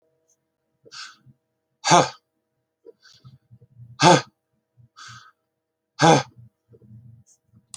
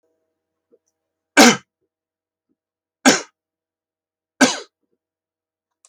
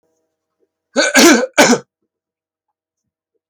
{
  "exhalation_length": "7.8 s",
  "exhalation_amplitude": 30983,
  "exhalation_signal_mean_std_ratio": 0.23,
  "three_cough_length": "5.9 s",
  "three_cough_amplitude": 32768,
  "three_cough_signal_mean_std_ratio": 0.21,
  "cough_length": "3.5 s",
  "cough_amplitude": 32768,
  "cough_signal_mean_std_ratio": 0.36,
  "survey_phase": "alpha (2021-03-01 to 2021-08-12)",
  "age": "45-64",
  "gender": "Male",
  "wearing_mask": "No",
  "symptom_cough_any": true,
  "symptom_onset": "12 days",
  "smoker_status": "Ex-smoker",
  "respiratory_condition_asthma": false,
  "respiratory_condition_other": false,
  "recruitment_source": "REACT",
  "submission_delay": "2 days",
  "covid_test_result": "Negative",
  "covid_test_method": "RT-qPCR"
}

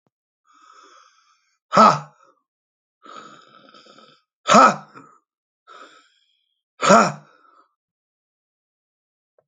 {
  "exhalation_length": "9.5 s",
  "exhalation_amplitude": 30583,
  "exhalation_signal_mean_std_ratio": 0.23,
  "survey_phase": "alpha (2021-03-01 to 2021-08-12)",
  "age": "45-64",
  "gender": "Male",
  "wearing_mask": "No",
  "symptom_shortness_of_breath": true,
  "smoker_status": "Ex-smoker",
  "respiratory_condition_asthma": true,
  "respiratory_condition_other": true,
  "recruitment_source": "REACT",
  "submission_delay": "2 days",
  "covid_test_result": "Negative",
  "covid_test_method": "RT-qPCR"
}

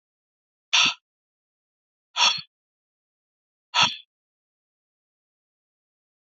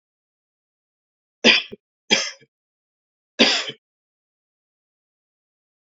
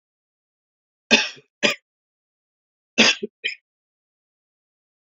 {
  "exhalation_length": "6.3 s",
  "exhalation_amplitude": 17025,
  "exhalation_signal_mean_std_ratio": 0.23,
  "three_cough_length": "6.0 s",
  "three_cough_amplitude": 30677,
  "three_cough_signal_mean_std_ratio": 0.23,
  "cough_length": "5.1 s",
  "cough_amplitude": 29402,
  "cough_signal_mean_std_ratio": 0.23,
  "survey_phase": "beta (2021-08-13 to 2022-03-07)",
  "age": "18-44",
  "gender": "Male",
  "wearing_mask": "No",
  "symptom_sore_throat": true,
  "symptom_change_to_sense_of_smell_or_taste": true,
  "smoker_status": "Never smoked",
  "respiratory_condition_asthma": false,
  "respiratory_condition_other": false,
  "recruitment_source": "Test and Trace",
  "submission_delay": "1 day",
  "covid_test_result": "Positive",
  "covid_test_method": "RT-qPCR"
}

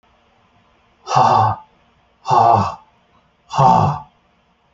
{
  "exhalation_length": "4.7 s",
  "exhalation_amplitude": 27602,
  "exhalation_signal_mean_std_ratio": 0.45,
  "survey_phase": "alpha (2021-03-01 to 2021-08-12)",
  "age": "18-44",
  "gender": "Male",
  "wearing_mask": "No",
  "symptom_none": true,
  "smoker_status": "Ex-smoker",
  "respiratory_condition_asthma": false,
  "respiratory_condition_other": false,
  "recruitment_source": "REACT",
  "submission_delay": "2 days",
  "covid_test_result": "Negative",
  "covid_test_method": "RT-qPCR"
}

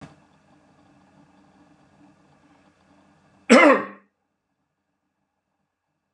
{
  "cough_length": "6.1 s",
  "cough_amplitude": 32134,
  "cough_signal_mean_std_ratio": 0.19,
  "survey_phase": "beta (2021-08-13 to 2022-03-07)",
  "age": "65+",
  "gender": "Male",
  "wearing_mask": "No",
  "symptom_none": true,
  "smoker_status": "Ex-smoker",
  "respiratory_condition_asthma": false,
  "respiratory_condition_other": false,
  "recruitment_source": "REACT",
  "submission_delay": "1 day",
  "covid_test_result": "Negative",
  "covid_test_method": "RT-qPCR"
}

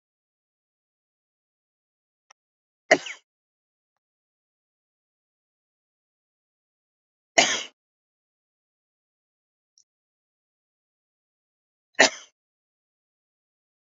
{
  "three_cough_length": "13.9 s",
  "three_cough_amplitude": 29019,
  "three_cough_signal_mean_std_ratio": 0.12,
  "survey_phase": "beta (2021-08-13 to 2022-03-07)",
  "age": "45-64",
  "gender": "Male",
  "wearing_mask": "No",
  "symptom_none": true,
  "symptom_onset": "12 days",
  "smoker_status": "Never smoked",
  "respiratory_condition_asthma": true,
  "respiratory_condition_other": false,
  "recruitment_source": "REACT",
  "submission_delay": "3 days",
  "covid_test_result": "Negative",
  "covid_test_method": "RT-qPCR",
  "influenza_a_test_result": "Negative",
  "influenza_b_test_result": "Negative"
}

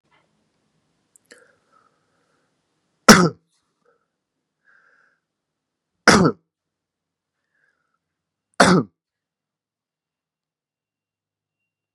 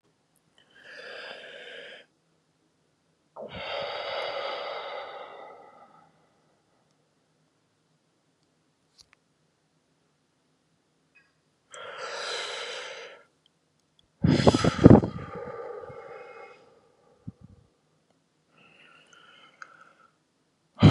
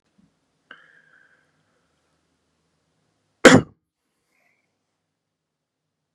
{
  "three_cough_length": "11.9 s",
  "three_cough_amplitude": 32768,
  "three_cough_signal_mean_std_ratio": 0.17,
  "exhalation_length": "20.9 s",
  "exhalation_amplitude": 32767,
  "exhalation_signal_mean_std_ratio": 0.22,
  "cough_length": "6.1 s",
  "cough_amplitude": 32768,
  "cough_signal_mean_std_ratio": 0.13,
  "survey_phase": "beta (2021-08-13 to 2022-03-07)",
  "age": "18-44",
  "gender": "Male",
  "wearing_mask": "No",
  "symptom_runny_or_blocked_nose": true,
  "smoker_status": "Ex-smoker",
  "respiratory_condition_asthma": false,
  "respiratory_condition_other": false,
  "recruitment_source": "REACT",
  "submission_delay": "2 days",
  "covid_test_result": "Negative",
  "covid_test_method": "RT-qPCR",
  "influenza_a_test_result": "Negative",
  "influenza_b_test_result": "Negative"
}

